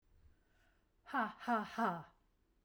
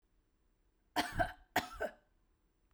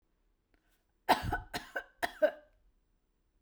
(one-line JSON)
{"exhalation_length": "2.6 s", "exhalation_amplitude": 2175, "exhalation_signal_mean_std_ratio": 0.42, "cough_length": "2.7 s", "cough_amplitude": 4087, "cough_signal_mean_std_ratio": 0.33, "three_cough_length": "3.4 s", "three_cough_amplitude": 6979, "three_cough_signal_mean_std_ratio": 0.29, "survey_phase": "beta (2021-08-13 to 2022-03-07)", "age": "45-64", "gender": "Female", "wearing_mask": "No", "symptom_none": true, "symptom_onset": "3 days", "smoker_status": "Never smoked", "respiratory_condition_asthma": false, "respiratory_condition_other": false, "recruitment_source": "REACT", "submission_delay": "1 day", "covid_test_result": "Negative", "covid_test_method": "RT-qPCR", "influenza_a_test_result": "Negative", "influenza_b_test_result": "Negative"}